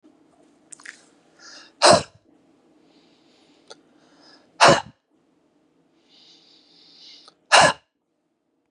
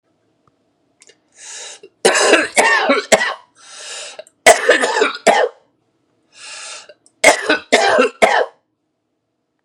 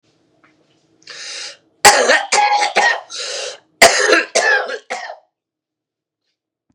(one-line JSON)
{"exhalation_length": "8.7 s", "exhalation_amplitude": 31944, "exhalation_signal_mean_std_ratio": 0.22, "three_cough_length": "9.6 s", "three_cough_amplitude": 32768, "three_cough_signal_mean_std_ratio": 0.45, "cough_length": "6.7 s", "cough_amplitude": 32768, "cough_signal_mean_std_ratio": 0.45, "survey_phase": "beta (2021-08-13 to 2022-03-07)", "age": "45-64", "gender": "Male", "wearing_mask": "No", "symptom_none": true, "smoker_status": "Ex-smoker", "respiratory_condition_asthma": false, "respiratory_condition_other": false, "recruitment_source": "REACT", "submission_delay": "2 days", "covid_test_result": "Negative", "covid_test_method": "RT-qPCR", "influenza_a_test_result": "Negative", "influenza_b_test_result": "Negative"}